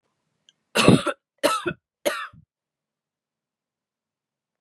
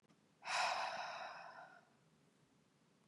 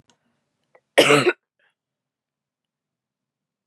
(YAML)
three_cough_length: 4.6 s
three_cough_amplitude: 32768
three_cough_signal_mean_std_ratio: 0.27
exhalation_length: 3.1 s
exhalation_amplitude: 1503
exhalation_signal_mean_std_ratio: 0.49
cough_length: 3.7 s
cough_amplitude: 31143
cough_signal_mean_std_ratio: 0.23
survey_phase: beta (2021-08-13 to 2022-03-07)
age: 18-44
gender: Female
wearing_mask: 'No'
symptom_cough_any: true
symptom_runny_or_blocked_nose: true
symptom_sore_throat: true
symptom_abdominal_pain: true
symptom_fatigue: true
symptom_fever_high_temperature: true
symptom_onset: 5 days
smoker_status: Ex-smoker
respiratory_condition_asthma: false
respiratory_condition_other: false
recruitment_source: Test and Trace
submission_delay: 1 day
covid_test_result: Positive
covid_test_method: LAMP